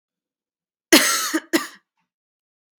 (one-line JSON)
{"cough_length": "2.8 s", "cough_amplitude": 32767, "cough_signal_mean_std_ratio": 0.31, "survey_phase": "beta (2021-08-13 to 2022-03-07)", "age": "18-44", "gender": "Female", "wearing_mask": "No", "symptom_runny_or_blocked_nose": true, "smoker_status": "Never smoked", "respiratory_condition_asthma": false, "respiratory_condition_other": false, "recruitment_source": "REACT", "submission_delay": "2 days", "covid_test_result": "Negative", "covid_test_method": "RT-qPCR", "influenza_a_test_result": "Negative", "influenza_b_test_result": "Negative"}